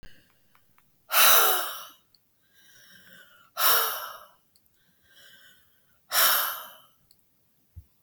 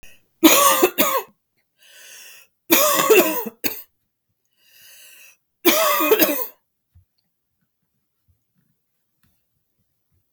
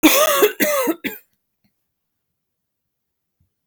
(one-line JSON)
{"exhalation_length": "8.0 s", "exhalation_amplitude": 18870, "exhalation_signal_mean_std_ratio": 0.35, "three_cough_length": "10.3 s", "three_cough_amplitude": 32766, "three_cough_signal_mean_std_ratio": 0.38, "cough_length": "3.7 s", "cough_amplitude": 32766, "cough_signal_mean_std_ratio": 0.39, "survey_phase": "beta (2021-08-13 to 2022-03-07)", "age": "45-64", "gender": "Female", "wearing_mask": "No", "symptom_none": true, "smoker_status": "Never smoked", "respiratory_condition_asthma": false, "respiratory_condition_other": false, "recruitment_source": "REACT", "submission_delay": "3 days", "covid_test_result": "Negative", "covid_test_method": "RT-qPCR", "influenza_a_test_result": "Negative", "influenza_b_test_result": "Negative"}